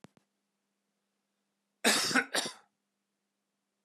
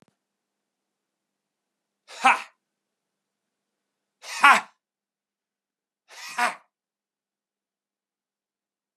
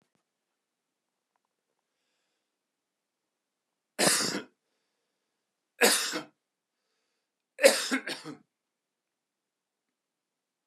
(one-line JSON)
{"cough_length": "3.8 s", "cough_amplitude": 8883, "cough_signal_mean_std_ratio": 0.29, "exhalation_length": "9.0 s", "exhalation_amplitude": 27876, "exhalation_signal_mean_std_ratio": 0.17, "three_cough_length": "10.7 s", "three_cough_amplitude": 19822, "three_cough_signal_mean_std_ratio": 0.23, "survey_phase": "beta (2021-08-13 to 2022-03-07)", "age": "45-64", "gender": "Male", "wearing_mask": "No", "symptom_none": true, "smoker_status": "Ex-smoker", "respiratory_condition_asthma": false, "respiratory_condition_other": false, "recruitment_source": "REACT", "submission_delay": "1 day", "covid_test_result": "Negative", "covid_test_method": "RT-qPCR", "influenza_a_test_result": "Negative", "influenza_b_test_result": "Negative"}